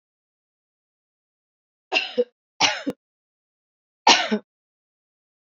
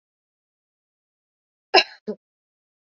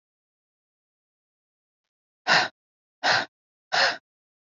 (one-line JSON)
{"three_cough_length": "5.5 s", "three_cough_amplitude": 28229, "three_cough_signal_mean_std_ratio": 0.25, "cough_length": "2.9 s", "cough_amplitude": 30433, "cough_signal_mean_std_ratio": 0.15, "exhalation_length": "4.5 s", "exhalation_amplitude": 20588, "exhalation_signal_mean_std_ratio": 0.29, "survey_phase": "beta (2021-08-13 to 2022-03-07)", "age": "18-44", "gender": "Female", "wearing_mask": "No", "symptom_cough_any": true, "symptom_runny_or_blocked_nose": true, "symptom_fatigue": true, "symptom_headache": true, "symptom_change_to_sense_of_smell_or_taste": true, "smoker_status": "Never smoked", "respiratory_condition_asthma": true, "respiratory_condition_other": false, "recruitment_source": "Test and Trace", "submission_delay": "1 day", "covid_test_result": "Positive", "covid_test_method": "ePCR"}